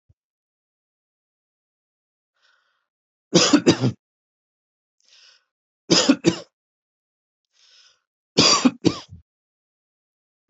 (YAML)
three_cough_length: 10.5 s
three_cough_amplitude: 27718
three_cough_signal_mean_std_ratio: 0.26
survey_phase: beta (2021-08-13 to 2022-03-07)
age: 45-64
gender: Male
wearing_mask: 'No'
symptom_none: true
smoker_status: Never smoked
respiratory_condition_asthma: true
respiratory_condition_other: false
recruitment_source: REACT
submission_delay: 1 day
covid_test_result: Negative
covid_test_method: RT-qPCR